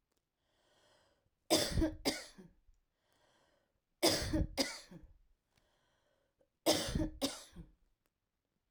{"three_cough_length": "8.7 s", "three_cough_amplitude": 5311, "three_cough_signal_mean_std_ratio": 0.36, "survey_phase": "alpha (2021-03-01 to 2021-08-12)", "age": "45-64", "gender": "Female", "wearing_mask": "No", "symptom_cough_any": true, "smoker_status": "Never smoked", "respiratory_condition_asthma": false, "respiratory_condition_other": false, "recruitment_source": "REACT", "submission_delay": "2 days", "covid_test_result": "Negative", "covid_test_method": "RT-qPCR"}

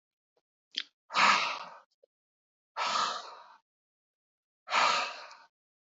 {"exhalation_length": "5.9 s", "exhalation_amplitude": 8049, "exhalation_signal_mean_std_ratio": 0.38, "survey_phase": "beta (2021-08-13 to 2022-03-07)", "age": "45-64", "gender": "Male", "wearing_mask": "No", "symptom_none": true, "smoker_status": "Never smoked", "respiratory_condition_asthma": false, "respiratory_condition_other": false, "recruitment_source": "REACT", "submission_delay": "3 days", "covid_test_result": "Negative", "covid_test_method": "RT-qPCR", "influenza_a_test_result": "Negative", "influenza_b_test_result": "Negative"}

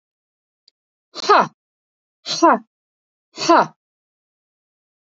{"exhalation_length": "5.1 s", "exhalation_amplitude": 29287, "exhalation_signal_mean_std_ratio": 0.27, "survey_phase": "beta (2021-08-13 to 2022-03-07)", "age": "45-64", "gender": "Female", "wearing_mask": "No", "symptom_none": true, "symptom_onset": "8 days", "smoker_status": "Never smoked", "respiratory_condition_asthma": false, "respiratory_condition_other": false, "recruitment_source": "REACT", "submission_delay": "1 day", "covid_test_result": "Negative", "covid_test_method": "RT-qPCR", "influenza_a_test_result": "Unknown/Void", "influenza_b_test_result": "Unknown/Void"}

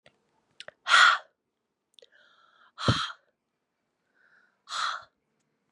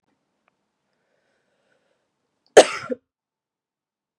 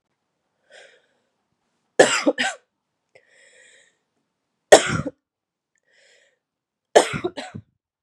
{"exhalation_length": "5.7 s", "exhalation_amplitude": 15920, "exhalation_signal_mean_std_ratio": 0.26, "cough_length": "4.2 s", "cough_amplitude": 32768, "cough_signal_mean_std_ratio": 0.13, "three_cough_length": "8.0 s", "three_cough_amplitude": 32768, "three_cough_signal_mean_std_ratio": 0.22, "survey_phase": "beta (2021-08-13 to 2022-03-07)", "age": "18-44", "gender": "Female", "wearing_mask": "No", "symptom_cough_any": true, "symptom_runny_or_blocked_nose": true, "symptom_diarrhoea": true, "symptom_other": true, "smoker_status": "Current smoker (1 to 10 cigarettes per day)", "respiratory_condition_asthma": false, "respiratory_condition_other": false, "recruitment_source": "Test and Trace", "submission_delay": "2 days", "covid_test_result": "Positive", "covid_test_method": "RT-qPCR", "covid_ct_value": 15.9, "covid_ct_gene": "ORF1ab gene"}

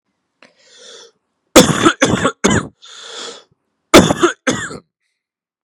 {"cough_length": "5.6 s", "cough_amplitude": 32768, "cough_signal_mean_std_ratio": 0.37, "survey_phase": "beta (2021-08-13 to 2022-03-07)", "age": "18-44", "gender": "Male", "wearing_mask": "No", "symptom_cough_any": true, "symptom_runny_or_blocked_nose": true, "symptom_sore_throat": true, "symptom_diarrhoea": true, "symptom_headache": true, "symptom_onset": "3 days", "smoker_status": "Ex-smoker", "respiratory_condition_asthma": false, "respiratory_condition_other": false, "recruitment_source": "Test and Trace", "submission_delay": "1 day", "covid_test_result": "Positive", "covid_test_method": "RT-qPCR", "covid_ct_value": 18.5, "covid_ct_gene": "N gene"}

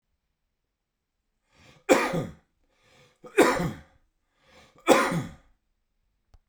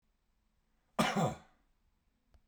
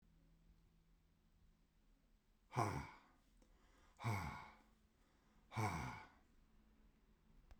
{"three_cough_length": "6.5 s", "three_cough_amplitude": 28003, "three_cough_signal_mean_std_ratio": 0.3, "cough_length": "2.5 s", "cough_amplitude": 4852, "cough_signal_mean_std_ratio": 0.31, "exhalation_length": "7.6 s", "exhalation_amplitude": 1733, "exhalation_signal_mean_std_ratio": 0.37, "survey_phase": "beta (2021-08-13 to 2022-03-07)", "age": "45-64", "gender": "Male", "wearing_mask": "No", "symptom_cough_any": true, "symptom_runny_or_blocked_nose": true, "symptom_sore_throat": true, "symptom_fatigue": true, "symptom_fever_high_temperature": true, "symptom_headache": true, "symptom_change_to_sense_of_smell_or_taste": true, "smoker_status": "Ex-smoker", "respiratory_condition_asthma": false, "respiratory_condition_other": false, "recruitment_source": "Test and Trace", "submission_delay": "1 day", "covid_test_result": "Positive", "covid_test_method": "RT-qPCR", "covid_ct_value": 12.7, "covid_ct_gene": "ORF1ab gene", "covid_ct_mean": 13.1, "covid_viral_load": "52000000 copies/ml", "covid_viral_load_category": "High viral load (>1M copies/ml)"}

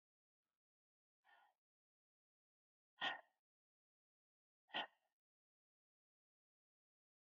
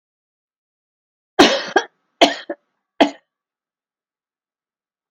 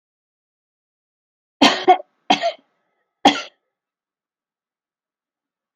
{"exhalation_length": "7.2 s", "exhalation_amplitude": 1015, "exhalation_signal_mean_std_ratio": 0.16, "cough_length": "5.1 s", "cough_amplitude": 32768, "cough_signal_mean_std_ratio": 0.23, "three_cough_length": "5.8 s", "three_cough_amplitude": 28978, "three_cough_signal_mean_std_ratio": 0.23, "survey_phase": "alpha (2021-03-01 to 2021-08-12)", "age": "65+", "gender": "Female", "wearing_mask": "No", "symptom_none": true, "smoker_status": "Ex-smoker", "respiratory_condition_asthma": false, "respiratory_condition_other": false, "recruitment_source": "REACT", "submission_delay": "3 days", "covid_test_result": "Negative", "covid_test_method": "RT-qPCR"}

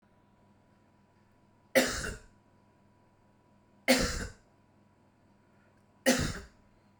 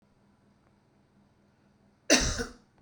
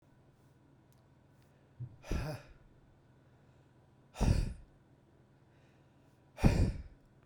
{"three_cough_length": "7.0 s", "three_cough_amplitude": 10993, "three_cough_signal_mean_std_ratio": 0.3, "cough_length": "2.8 s", "cough_amplitude": 20004, "cough_signal_mean_std_ratio": 0.26, "exhalation_length": "7.3 s", "exhalation_amplitude": 9265, "exhalation_signal_mean_std_ratio": 0.31, "survey_phase": "beta (2021-08-13 to 2022-03-07)", "age": "18-44", "gender": "Male", "wearing_mask": "No", "symptom_cough_any": true, "symptom_runny_or_blocked_nose": true, "symptom_shortness_of_breath": true, "symptom_sore_throat": true, "symptom_fatigue": true, "symptom_fever_high_temperature": true, "symptom_headache": true, "symptom_change_to_sense_of_smell_or_taste": true, "symptom_loss_of_taste": true, "symptom_onset": "3 days", "smoker_status": "Never smoked", "respiratory_condition_asthma": false, "respiratory_condition_other": true, "recruitment_source": "Test and Trace", "submission_delay": "2 days", "covid_test_result": "Positive", "covid_test_method": "RT-qPCR", "covid_ct_value": 12.1, "covid_ct_gene": "ORF1ab gene", "covid_ct_mean": 13.1, "covid_viral_load": "49000000 copies/ml", "covid_viral_load_category": "High viral load (>1M copies/ml)"}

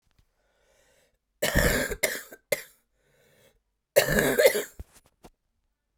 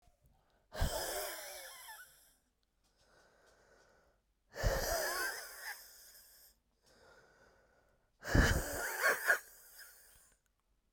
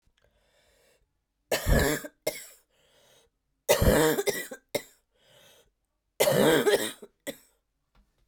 {"cough_length": "6.0 s", "cough_amplitude": 19162, "cough_signal_mean_std_ratio": 0.36, "exhalation_length": "10.9 s", "exhalation_amplitude": 5903, "exhalation_signal_mean_std_ratio": 0.4, "three_cough_length": "8.3 s", "three_cough_amplitude": 16111, "three_cough_signal_mean_std_ratio": 0.39, "survey_phase": "beta (2021-08-13 to 2022-03-07)", "age": "18-44", "gender": "Female", "wearing_mask": "No", "symptom_cough_any": true, "symptom_new_continuous_cough": true, "symptom_runny_or_blocked_nose": true, "symptom_shortness_of_breath": true, "symptom_fatigue": true, "symptom_fever_high_temperature": true, "symptom_headache": true, "symptom_change_to_sense_of_smell_or_taste": true, "symptom_loss_of_taste": true, "symptom_onset": "3 days", "smoker_status": "Never smoked", "respiratory_condition_asthma": false, "respiratory_condition_other": false, "recruitment_source": "Test and Trace", "submission_delay": "1 day", "covid_test_result": "Positive", "covid_test_method": "ePCR"}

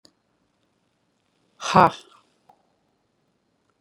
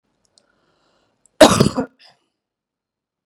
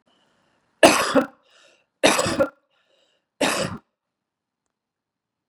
{"exhalation_length": "3.8 s", "exhalation_amplitude": 29490, "exhalation_signal_mean_std_ratio": 0.16, "cough_length": "3.3 s", "cough_amplitude": 32768, "cough_signal_mean_std_ratio": 0.22, "three_cough_length": "5.5 s", "three_cough_amplitude": 32768, "three_cough_signal_mean_std_ratio": 0.31, "survey_phase": "beta (2021-08-13 to 2022-03-07)", "age": "45-64", "gender": "Female", "wearing_mask": "No", "symptom_none": true, "smoker_status": "Never smoked", "respiratory_condition_asthma": false, "respiratory_condition_other": false, "recruitment_source": "REACT", "submission_delay": "7 days", "covid_test_result": "Negative", "covid_test_method": "RT-qPCR", "influenza_a_test_result": "Negative", "influenza_b_test_result": "Negative"}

